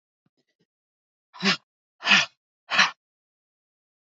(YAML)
exhalation_length: 4.2 s
exhalation_amplitude: 21547
exhalation_signal_mean_std_ratio: 0.26
survey_phase: beta (2021-08-13 to 2022-03-07)
age: 45-64
gender: Female
wearing_mask: 'No'
symptom_cough_any: true
symptom_runny_or_blocked_nose: true
symptom_sore_throat: true
symptom_fatigue: true
symptom_onset: 5 days
smoker_status: Never smoked
respiratory_condition_asthma: false
respiratory_condition_other: false
recruitment_source: Test and Trace
submission_delay: 1 day
covid_test_result: Negative
covid_test_method: RT-qPCR